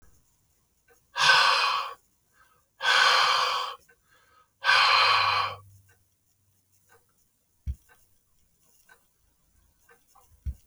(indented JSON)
{
  "exhalation_length": "10.7 s",
  "exhalation_amplitude": 17282,
  "exhalation_signal_mean_std_ratio": 0.41,
  "survey_phase": "alpha (2021-03-01 to 2021-08-12)",
  "age": "45-64",
  "gender": "Male",
  "wearing_mask": "No",
  "symptom_none": true,
  "smoker_status": "Ex-smoker",
  "respiratory_condition_asthma": false,
  "respiratory_condition_other": false,
  "recruitment_source": "REACT",
  "submission_delay": "1 day",
  "covid_test_result": "Negative",
  "covid_test_method": "RT-qPCR"
}